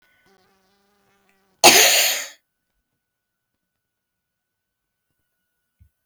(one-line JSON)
{"cough_length": "6.1 s", "cough_amplitude": 32768, "cough_signal_mean_std_ratio": 0.23, "survey_phase": "beta (2021-08-13 to 2022-03-07)", "age": "65+", "gender": "Female", "wearing_mask": "No", "symptom_fatigue": true, "smoker_status": "Never smoked", "respiratory_condition_asthma": false, "respiratory_condition_other": false, "recruitment_source": "REACT", "submission_delay": "1 day", "covid_test_result": "Negative", "covid_test_method": "RT-qPCR"}